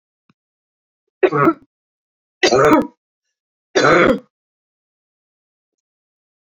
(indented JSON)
{
  "three_cough_length": "6.6 s",
  "three_cough_amplitude": 27762,
  "three_cough_signal_mean_std_ratio": 0.33,
  "survey_phase": "beta (2021-08-13 to 2022-03-07)",
  "age": "65+",
  "gender": "Female",
  "wearing_mask": "No",
  "symptom_none": true,
  "smoker_status": "Ex-smoker",
  "respiratory_condition_asthma": false,
  "respiratory_condition_other": false,
  "recruitment_source": "REACT",
  "submission_delay": "1 day",
  "covid_test_result": "Negative",
  "covid_test_method": "RT-qPCR"
}